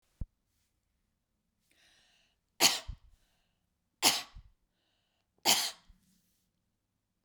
{"three_cough_length": "7.2 s", "three_cough_amplitude": 13097, "three_cough_signal_mean_std_ratio": 0.22, "survey_phase": "beta (2021-08-13 to 2022-03-07)", "age": "45-64", "gender": "Female", "wearing_mask": "Yes", "symptom_none": true, "smoker_status": "Never smoked", "respiratory_condition_asthma": false, "respiratory_condition_other": false, "recruitment_source": "REACT", "submission_delay": "2 days", "covid_test_result": "Negative", "covid_test_method": "RT-qPCR", "influenza_a_test_result": "Negative", "influenza_b_test_result": "Negative"}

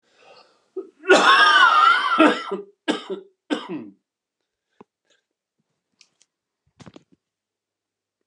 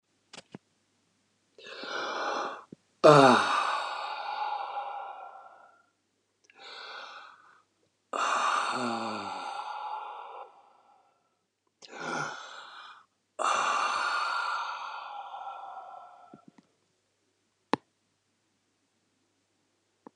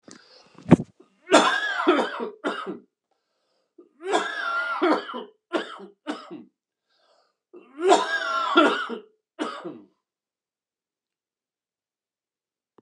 {"cough_length": "8.3 s", "cough_amplitude": 29493, "cough_signal_mean_std_ratio": 0.36, "exhalation_length": "20.2 s", "exhalation_amplitude": 21391, "exhalation_signal_mean_std_ratio": 0.4, "three_cough_length": "12.8 s", "three_cough_amplitude": 31176, "three_cough_signal_mean_std_ratio": 0.39, "survey_phase": "beta (2021-08-13 to 2022-03-07)", "age": "45-64", "gender": "Male", "wearing_mask": "No", "symptom_cough_any": true, "smoker_status": "Ex-smoker", "respiratory_condition_asthma": false, "respiratory_condition_other": false, "recruitment_source": "REACT", "submission_delay": "3 days", "covid_test_result": "Negative", "covid_test_method": "RT-qPCR", "influenza_a_test_result": "Negative", "influenza_b_test_result": "Negative"}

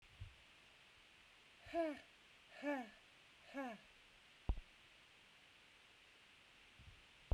{"exhalation_length": "7.3 s", "exhalation_amplitude": 1483, "exhalation_signal_mean_std_ratio": 0.37, "survey_phase": "beta (2021-08-13 to 2022-03-07)", "age": "45-64", "gender": "Female", "wearing_mask": "No", "symptom_none": true, "symptom_onset": "2 days", "smoker_status": "Never smoked", "respiratory_condition_asthma": false, "respiratory_condition_other": false, "recruitment_source": "REACT", "submission_delay": "2 days", "covid_test_result": "Negative", "covid_test_method": "RT-qPCR"}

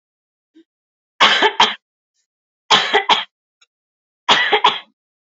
{"three_cough_length": "5.4 s", "three_cough_amplitude": 29403, "three_cough_signal_mean_std_ratio": 0.38, "survey_phase": "beta (2021-08-13 to 2022-03-07)", "age": "18-44", "gender": "Female", "wearing_mask": "No", "symptom_none": true, "smoker_status": "Never smoked", "respiratory_condition_asthma": false, "respiratory_condition_other": false, "recruitment_source": "REACT", "submission_delay": "1 day", "covid_test_result": "Negative", "covid_test_method": "RT-qPCR", "influenza_a_test_result": "Negative", "influenza_b_test_result": "Negative"}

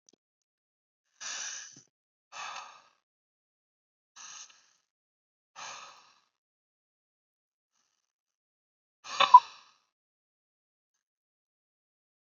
{"exhalation_length": "12.3 s", "exhalation_amplitude": 20672, "exhalation_signal_mean_std_ratio": 0.11, "survey_phase": "beta (2021-08-13 to 2022-03-07)", "age": "18-44", "gender": "Male", "wearing_mask": "No", "symptom_none": true, "smoker_status": "Never smoked", "respiratory_condition_asthma": false, "respiratory_condition_other": false, "recruitment_source": "REACT", "submission_delay": "3 days", "covid_test_result": "Negative", "covid_test_method": "RT-qPCR", "influenza_a_test_result": "Negative", "influenza_b_test_result": "Negative"}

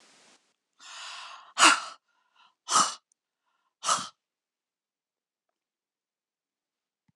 {"exhalation_length": "7.2 s", "exhalation_amplitude": 22932, "exhalation_signal_mean_std_ratio": 0.23, "survey_phase": "beta (2021-08-13 to 2022-03-07)", "age": "65+", "gender": "Female", "wearing_mask": "No", "symptom_none": true, "smoker_status": "Never smoked", "respiratory_condition_asthma": false, "respiratory_condition_other": false, "recruitment_source": "REACT", "submission_delay": "5 days", "covid_test_result": "Negative", "covid_test_method": "RT-qPCR", "influenza_a_test_result": "Negative", "influenza_b_test_result": "Negative"}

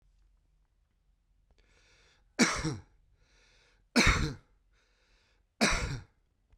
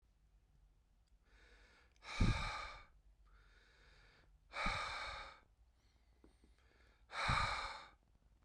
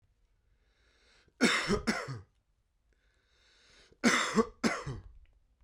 {"three_cough_length": "6.6 s", "three_cough_amplitude": 10799, "three_cough_signal_mean_std_ratio": 0.31, "exhalation_length": "8.4 s", "exhalation_amplitude": 2612, "exhalation_signal_mean_std_ratio": 0.4, "cough_length": "5.6 s", "cough_amplitude": 7843, "cough_signal_mean_std_ratio": 0.37, "survey_phase": "beta (2021-08-13 to 2022-03-07)", "age": "45-64", "gender": "Male", "wearing_mask": "No", "symptom_runny_or_blocked_nose": true, "symptom_abdominal_pain": true, "symptom_fatigue": true, "smoker_status": "Current smoker (1 to 10 cigarettes per day)", "respiratory_condition_asthma": false, "respiratory_condition_other": false, "recruitment_source": "Test and Trace", "submission_delay": "2 days", "covid_test_result": "Positive", "covid_test_method": "RT-qPCR", "covid_ct_value": 24.7, "covid_ct_gene": "ORF1ab gene", "covid_ct_mean": 25.3, "covid_viral_load": "4900 copies/ml", "covid_viral_load_category": "Minimal viral load (< 10K copies/ml)"}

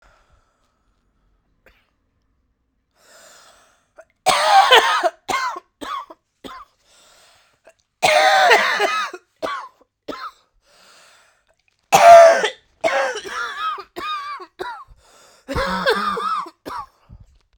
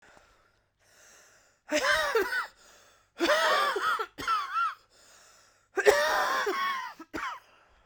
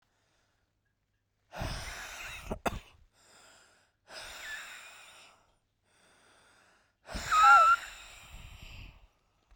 {"three_cough_length": "17.6 s", "three_cough_amplitude": 32768, "three_cough_signal_mean_std_ratio": 0.38, "cough_length": "7.9 s", "cough_amplitude": 18521, "cough_signal_mean_std_ratio": 0.57, "exhalation_length": "9.6 s", "exhalation_amplitude": 9134, "exhalation_signal_mean_std_ratio": 0.29, "survey_phase": "beta (2021-08-13 to 2022-03-07)", "age": "18-44", "gender": "Female", "wearing_mask": "No", "symptom_cough_any": true, "symptom_shortness_of_breath": true, "symptom_sore_throat": true, "symptom_diarrhoea": true, "symptom_fatigue": true, "symptom_headache": true, "smoker_status": "Ex-smoker", "respiratory_condition_asthma": false, "respiratory_condition_other": false, "recruitment_source": "Test and Trace", "submission_delay": "2 days", "covid_test_result": "Positive", "covid_test_method": "RT-qPCR", "covid_ct_value": 22.7, "covid_ct_gene": "ORF1ab gene", "covid_ct_mean": 23.4, "covid_viral_load": "21000 copies/ml", "covid_viral_load_category": "Low viral load (10K-1M copies/ml)"}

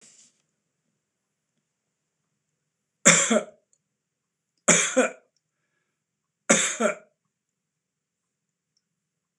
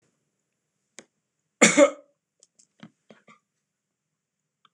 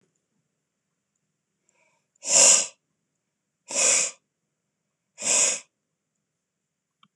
{"three_cough_length": "9.4 s", "three_cough_amplitude": 26028, "three_cough_signal_mean_std_ratio": 0.25, "cough_length": "4.7 s", "cough_amplitude": 25628, "cough_signal_mean_std_ratio": 0.18, "exhalation_length": "7.2 s", "exhalation_amplitude": 22523, "exhalation_signal_mean_std_ratio": 0.3, "survey_phase": "beta (2021-08-13 to 2022-03-07)", "age": "65+", "gender": "Male", "wearing_mask": "No", "symptom_none": true, "smoker_status": "Never smoked", "respiratory_condition_asthma": false, "respiratory_condition_other": false, "recruitment_source": "REACT", "submission_delay": "5 days", "covid_test_result": "Negative", "covid_test_method": "RT-qPCR"}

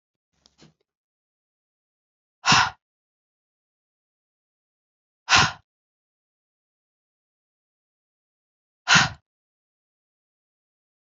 {"exhalation_length": "11.1 s", "exhalation_amplitude": 24835, "exhalation_signal_mean_std_ratio": 0.18, "survey_phase": "alpha (2021-03-01 to 2021-08-12)", "age": "18-44", "gender": "Female", "wearing_mask": "No", "symptom_cough_any": true, "symptom_shortness_of_breath": true, "symptom_fatigue": true, "symptom_fever_high_temperature": true, "symptom_headache": true, "symptom_onset": "3 days", "smoker_status": "Never smoked", "respiratory_condition_asthma": false, "respiratory_condition_other": false, "recruitment_source": "Test and Trace", "submission_delay": "1 day", "covid_test_result": "Positive", "covid_test_method": "ePCR"}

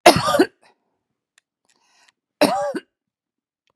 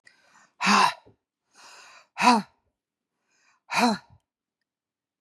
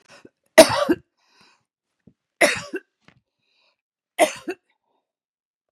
{"cough_length": "3.8 s", "cough_amplitude": 32768, "cough_signal_mean_std_ratio": 0.29, "exhalation_length": "5.2 s", "exhalation_amplitude": 18188, "exhalation_signal_mean_std_ratio": 0.31, "three_cough_length": "5.7 s", "three_cough_amplitude": 32768, "three_cough_signal_mean_std_ratio": 0.22, "survey_phase": "beta (2021-08-13 to 2022-03-07)", "age": "65+", "gender": "Female", "wearing_mask": "No", "symptom_none": true, "smoker_status": "Never smoked", "respiratory_condition_asthma": false, "respiratory_condition_other": false, "recruitment_source": "REACT", "submission_delay": "2 days", "covid_test_result": "Negative", "covid_test_method": "RT-qPCR", "influenza_a_test_result": "Negative", "influenza_b_test_result": "Negative"}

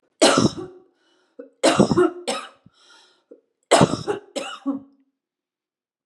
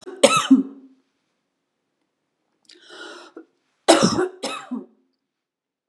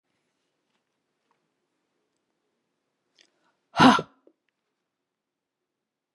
{"three_cough_length": "6.1 s", "three_cough_amplitude": 31075, "three_cough_signal_mean_std_ratio": 0.37, "cough_length": "5.9 s", "cough_amplitude": 32722, "cough_signal_mean_std_ratio": 0.3, "exhalation_length": "6.1 s", "exhalation_amplitude": 27990, "exhalation_signal_mean_std_ratio": 0.14, "survey_phase": "beta (2021-08-13 to 2022-03-07)", "age": "45-64", "gender": "Female", "wearing_mask": "No", "symptom_cough_any": true, "symptom_sore_throat": true, "symptom_diarrhoea": true, "symptom_fatigue": true, "symptom_headache": true, "symptom_onset": "3 days", "smoker_status": "Ex-smoker", "respiratory_condition_asthma": false, "respiratory_condition_other": false, "recruitment_source": "Test and Trace", "submission_delay": "1 day", "covid_test_result": "Positive", "covid_test_method": "RT-qPCR", "covid_ct_value": 20.2, "covid_ct_gene": "N gene"}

